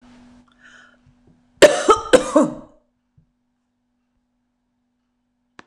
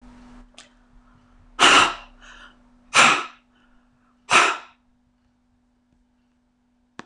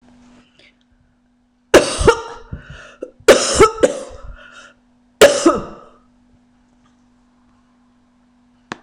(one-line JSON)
{"cough_length": "5.7 s", "cough_amplitude": 26028, "cough_signal_mean_std_ratio": 0.24, "exhalation_length": "7.1 s", "exhalation_amplitude": 26027, "exhalation_signal_mean_std_ratio": 0.29, "three_cough_length": "8.8 s", "three_cough_amplitude": 26028, "three_cough_signal_mean_std_ratio": 0.3, "survey_phase": "beta (2021-08-13 to 2022-03-07)", "age": "65+", "gender": "Female", "wearing_mask": "No", "symptom_none": true, "smoker_status": "Ex-smoker", "respiratory_condition_asthma": false, "respiratory_condition_other": false, "recruitment_source": "REACT", "submission_delay": "3 days", "covid_test_result": "Negative", "covid_test_method": "RT-qPCR", "influenza_a_test_result": "Negative", "influenza_b_test_result": "Negative"}